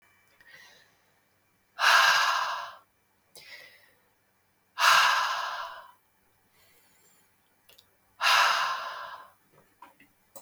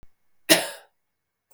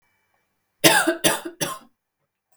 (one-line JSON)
{"exhalation_length": "10.4 s", "exhalation_amplitude": 16202, "exhalation_signal_mean_std_ratio": 0.39, "cough_length": "1.5 s", "cough_amplitude": 32768, "cough_signal_mean_std_ratio": 0.24, "three_cough_length": "2.6 s", "three_cough_amplitude": 32768, "three_cough_signal_mean_std_ratio": 0.36, "survey_phase": "beta (2021-08-13 to 2022-03-07)", "age": "18-44", "gender": "Female", "wearing_mask": "No", "symptom_cough_any": true, "symptom_new_continuous_cough": true, "symptom_runny_or_blocked_nose": true, "symptom_headache": true, "symptom_change_to_sense_of_smell_or_taste": true, "symptom_other": true, "symptom_onset": "3 days", "smoker_status": "Never smoked", "respiratory_condition_asthma": false, "respiratory_condition_other": false, "recruitment_source": "Test and Trace", "submission_delay": "2 days", "covid_test_result": "Positive", "covid_test_method": "ePCR"}